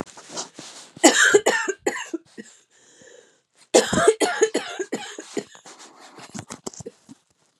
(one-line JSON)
{"cough_length": "7.6 s", "cough_amplitude": 32767, "cough_signal_mean_std_ratio": 0.38, "survey_phase": "beta (2021-08-13 to 2022-03-07)", "age": "45-64", "gender": "Female", "wearing_mask": "No", "symptom_cough_any": true, "symptom_runny_or_blocked_nose": true, "symptom_fatigue": true, "symptom_headache": true, "symptom_onset": "1 day", "smoker_status": "Never smoked", "respiratory_condition_asthma": true, "respiratory_condition_other": false, "recruitment_source": "Test and Trace", "submission_delay": "0 days", "covid_test_result": "Negative", "covid_test_method": "RT-qPCR"}